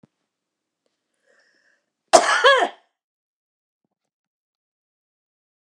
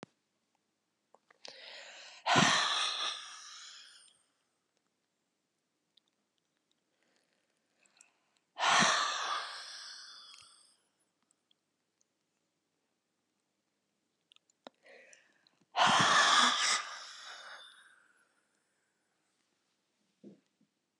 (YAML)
cough_length: 5.7 s
cough_amplitude: 32768
cough_signal_mean_std_ratio: 0.22
exhalation_length: 21.0 s
exhalation_amplitude: 7350
exhalation_signal_mean_std_ratio: 0.32
survey_phase: beta (2021-08-13 to 2022-03-07)
age: 65+
gender: Female
wearing_mask: 'No'
symptom_none: true
smoker_status: Current smoker (e-cigarettes or vapes only)
respiratory_condition_asthma: false
respiratory_condition_other: true
recruitment_source: REACT
submission_delay: 2 days
covid_test_result: Negative
covid_test_method: RT-qPCR
influenza_a_test_result: Negative
influenza_b_test_result: Negative